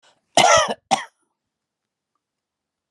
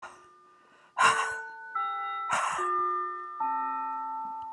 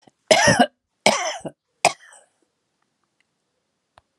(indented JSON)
{
  "cough_length": "2.9 s",
  "cough_amplitude": 28987,
  "cough_signal_mean_std_ratio": 0.3,
  "exhalation_length": "4.5 s",
  "exhalation_amplitude": 12074,
  "exhalation_signal_mean_std_ratio": 0.82,
  "three_cough_length": "4.2 s",
  "three_cough_amplitude": 32693,
  "three_cough_signal_mean_std_ratio": 0.3,
  "survey_phase": "alpha (2021-03-01 to 2021-08-12)",
  "age": "65+",
  "gender": "Female",
  "wearing_mask": "No",
  "symptom_none": true,
  "smoker_status": "Never smoked",
  "respiratory_condition_asthma": false,
  "respiratory_condition_other": false,
  "recruitment_source": "REACT",
  "submission_delay": "1 day",
  "covid_test_result": "Negative",
  "covid_test_method": "RT-qPCR"
}